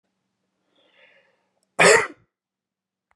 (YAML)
cough_length: 3.2 s
cough_amplitude: 27967
cough_signal_mean_std_ratio: 0.23
survey_phase: beta (2021-08-13 to 2022-03-07)
age: 45-64
gender: Male
wearing_mask: 'No'
symptom_none: true
smoker_status: Never smoked
respiratory_condition_asthma: false
respiratory_condition_other: false
recruitment_source: REACT
submission_delay: 13 days
covid_test_result: Negative
covid_test_method: RT-qPCR